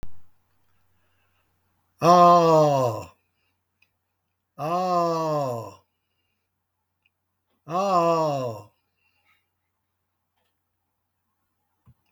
exhalation_length: 12.1 s
exhalation_amplitude: 24704
exhalation_signal_mean_std_ratio: 0.37
survey_phase: beta (2021-08-13 to 2022-03-07)
age: 65+
gender: Male
wearing_mask: 'No'
symptom_none: true
smoker_status: Ex-smoker
respiratory_condition_asthma: false
respiratory_condition_other: false
recruitment_source: REACT
submission_delay: 3 days
covid_test_result: Negative
covid_test_method: RT-qPCR
influenza_a_test_result: Negative
influenza_b_test_result: Negative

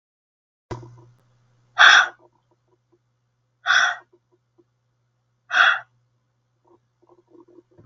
exhalation_length: 7.9 s
exhalation_amplitude: 32768
exhalation_signal_mean_std_ratio: 0.25
survey_phase: beta (2021-08-13 to 2022-03-07)
age: 18-44
gender: Female
wearing_mask: 'No'
symptom_abdominal_pain: true
symptom_onset: 2 days
smoker_status: Never smoked
respiratory_condition_asthma: false
respiratory_condition_other: false
recruitment_source: REACT
submission_delay: 1 day
covid_test_result: Negative
covid_test_method: RT-qPCR
influenza_a_test_result: Negative
influenza_b_test_result: Negative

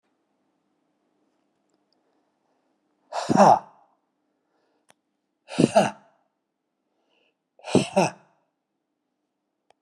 exhalation_length: 9.8 s
exhalation_amplitude: 25611
exhalation_signal_mean_std_ratio: 0.22
survey_phase: beta (2021-08-13 to 2022-03-07)
age: 65+
gender: Male
wearing_mask: 'No'
symptom_none: true
smoker_status: Ex-smoker
respiratory_condition_asthma: true
respiratory_condition_other: false
recruitment_source: REACT
submission_delay: 1 day
covid_test_result: Negative
covid_test_method: RT-qPCR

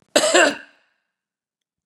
cough_length: 1.9 s
cough_amplitude: 27220
cough_signal_mean_std_ratio: 0.36
survey_phase: beta (2021-08-13 to 2022-03-07)
age: 65+
gender: Female
wearing_mask: 'No'
symptom_abdominal_pain: true
smoker_status: Never smoked
respiratory_condition_asthma: false
respiratory_condition_other: false
recruitment_source: REACT
submission_delay: 3 days
covid_test_result: Negative
covid_test_method: RT-qPCR
influenza_a_test_result: Negative
influenza_b_test_result: Negative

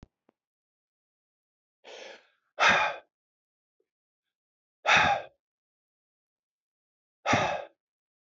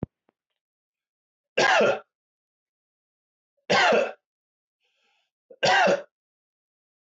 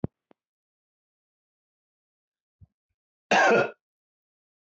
exhalation_length: 8.4 s
exhalation_amplitude: 12212
exhalation_signal_mean_std_ratio: 0.28
three_cough_length: 7.2 s
three_cough_amplitude: 14143
three_cough_signal_mean_std_ratio: 0.34
cough_length: 4.7 s
cough_amplitude: 11045
cough_signal_mean_std_ratio: 0.23
survey_phase: beta (2021-08-13 to 2022-03-07)
age: 45-64
gender: Male
wearing_mask: 'No'
symptom_none: true
smoker_status: Never smoked
respiratory_condition_asthma: true
respiratory_condition_other: false
recruitment_source: REACT
submission_delay: 0 days
covid_test_result: Negative
covid_test_method: RT-qPCR
influenza_a_test_result: Negative
influenza_b_test_result: Negative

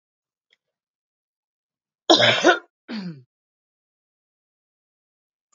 cough_length: 5.5 s
cough_amplitude: 28945
cough_signal_mean_std_ratio: 0.23
survey_phase: alpha (2021-03-01 to 2021-08-12)
age: 45-64
gender: Female
wearing_mask: 'No'
symptom_cough_any: true
symptom_shortness_of_breath: true
symptom_abdominal_pain: true
symptom_fatigue: true
symptom_change_to_sense_of_smell_or_taste: true
symptom_onset: 5 days
smoker_status: Ex-smoker
respiratory_condition_asthma: false
respiratory_condition_other: false
recruitment_source: Test and Trace
submission_delay: 1 day
covid_test_result: Positive
covid_test_method: RT-qPCR
covid_ct_value: 15.1
covid_ct_gene: ORF1ab gene
covid_ct_mean: 15.6
covid_viral_load: 7800000 copies/ml
covid_viral_load_category: High viral load (>1M copies/ml)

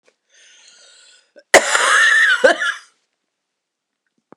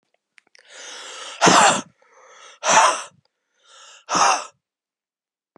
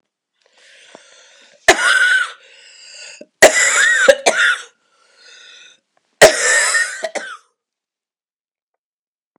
cough_length: 4.4 s
cough_amplitude: 32768
cough_signal_mean_std_ratio: 0.41
exhalation_length: 5.6 s
exhalation_amplitude: 30390
exhalation_signal_mean_std_ratio: 0.37
three_cough_length: 9.4 s
three_cough_amplitude: 32768
three_cough_signal_mean_std_ratio: 0.4
survey_phase: beta (2021-08-13 to 2022-03-07)
age: 45-64
gender: Female
wearing_mask: 'No'
symptom_cough_any: true
symptom_runny_or_blocked_nose: true
symptom_shortness_of_breath: true
symptom_sore_throat: true
symptom_fatigue: true
symptom_fever_high_temperature: true
symptom_headache: true
symptom_onset: 4 days
smoker_status: Current smoker (1 to 10 cigarettes per day)
respiratory_condition_asthma: false
respiratory_condition_other: false
recruitment_source: Test and Trace
submission_delay: 2 days
covid_test_result: Positive
covid_test_method: RT-qPCR
covid_ct_value: 22.4
covid_ct_gene: N gene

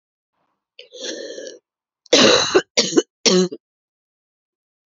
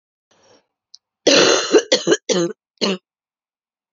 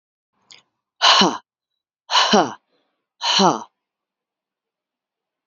cough_length: 4.9 s
cough_amplitude: 29946
cough_signal_mean_std_ratio: 0.36
three_cough_length: 3.9 s
three_cough_amplitude: 29433
three_cough_signal_mean_std_ratio: 0.41
exhalation_length: 5.5 s
exhalation_amplitude: 32267
exhalation_signal_mean_std_ratio: 0.34
survey_phase: beta (2021-08-13 to 2022-03-07)
age: 45-64
gender: Female
wearing_mask: 'No'
symptom_cough_any: true
symptom_runny_or_blocked_nose: true
symptom_onset: 1 day
smoker_status: Never smoked
respiratory_condition_asthma: false
respiratory_condition_other: false
recruitment_source: Test and Trace
submission_delay: 1 day
covid_test_result: Positive
covid_test_method: RT-qPCR
covid_ct_value: 33.0
covid_ct_gene: ORF1ab gene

